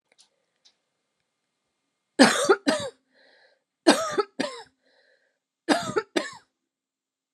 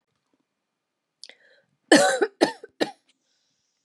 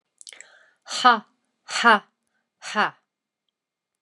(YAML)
three_cough_length: 7.3 s
three_cough_amplitude: 30984
three_cough_signal_mean_std_ratio: 0.29
cough_length: 3.8 s
cough_amplitude: 29407
cough_signal_mean_std_ratio: 0.26
exhalation_length: 4.0 s
exhalation_amplitude: 26433
exhalation_signal_mean_std_ratio: 0.29
survey_phase: alpha (2021-03-01 to 2021-08-12)
age: 45-64
gender: Female
wearing_mask: 'No'
symptom_none: true
smoker_status: Never smoked
respiratory_condition_asthma: false
respiratory_condition_other: false
recruitment_source: REACT
submission_delay: 2 days
covid_test_result: Negative
covid_test_method: RT-qPCR